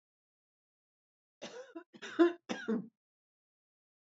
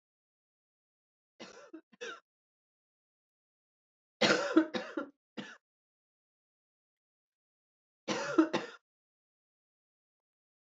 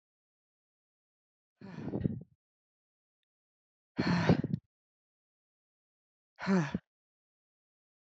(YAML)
cough_length: 4.2 s
cough_amplitude: 5620
cough_signal_mean_std_ratio: 0.25
three_cough_length: 10.7 s
three_cough_amplitude: 8193
three_cough_signal_mean_std_ratio: 0.24
exhalation_length: 8.0 s
exhalation_amplitude: 6655
exhalation_signal_mean_std_ratio: 0.28
survey_phase: beta (2021-08-13 to 2022-03-07)
age: 45-64
gender: Female
wearing_mask: 'No'
symptom_cough_any: true
symptom_runny_or_blocked_nose: true
symptom_shortness_of_breath: true
symptom_sore_throat: true
smoker_status: Ex-smoker
respiratory_condition_asthma: false
respiratory_condition_other: false
recruitment_source: Test and Trace
submission_delay: 1 day
covid_test_result: Positive
covid_test_method: ePCR